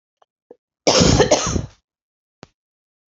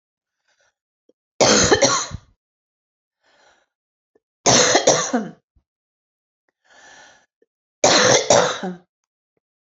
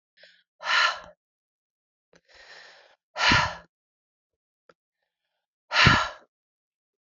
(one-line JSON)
{"cough_length": "3.2 s", "cough_amplitude": 29077, "cough_signal_mean_std_ratio": 0.37, "three_cough_length": "9.7 s", "three_cough_amplitude": 30329, "three_cough_signal_mean_std_ratio": 0.37, "exhalation_length": "7.2 s", "exhalation_amplitude": 24486, "exhalation_signal_mean_std_ratio": 0.29, "survey_phase": "alpha (2021-03-01 to 2021-08-12)", "age": "45-64", "gender": "Female", "wearing_mask": "Yes", "symptom_cough_any": true, "symptom_new_continuous_cough": true, "symptom_shortness_of_breath": true, "symptom_abdominal_pain": true, "symptom_fatigue": true, "symptom_fever_high_temperature": true, "symptom_headache": true, "symptom_onset": "3 days", "smoker_status": "Never smoked", "respiratory_condition_asthma": false, "respiratory_condition_other": false, "recruitment_source": "Test and Trace", "submission_delay": "2 days", "covid_test_result": "Positive", "covid_test_method": "RT-qPCR", "covid_ct_value": 19.5, "covid_ct_gene": "ORF1ab gene", "covid_ct_mean": 20.8, "covid_viral_load": "150000 copies/ml", "covid_viral_load_category": "Low viral load (10K-1M copies/ml)"}